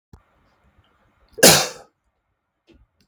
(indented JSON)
{
  "cough_length": "3.1 s",
  "cough_amplitude": 32768,
  "cough_signal_mean_std_ratio": 0.22,
  "survey_phase": "beta (2021-08-13 to 2022-03-07)",
  "age": "45-64",
  "gender": "Male",
  "wearing_mask": "No",
  "symptom_none": true,
  "smoker_status": "Never smoked",
  "respiratory_condition_asthma": false,
  "respiratory_condition_other": false,
  "recruitment_source": "REACT",
  "submission_delay": "4 days",
  "covid_test_result": "Negative",
  "covid_test_method": "RT-qPCR",
  "influenza_a_test_result": "Negative",
  "influenza_b_test_result": "Negative"
}